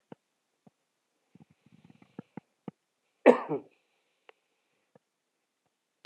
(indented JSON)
{
  "cough_length": "6.1 s",
  "cough_amplitude": 24024,
  "cough_signal_mean_std_ratio": 0.13,
  "survey_phase": "beta (2021-08-13 to 2022-03-07)",
  "age": "45-64",
  "gender": "Male",
  "wearing_mask": "No",
  "symptom_none": true,
  "smoker_status": "Ex-smoker",
  "respiratory_condition_asthma": false,
  "respiratory_condition_other": false,
  "recruitment_source": "REACT",
  "submission_delay": "2 days",
  "covid_test_result": "Negative",
  "covid_test_method": "RT-qPCR"
}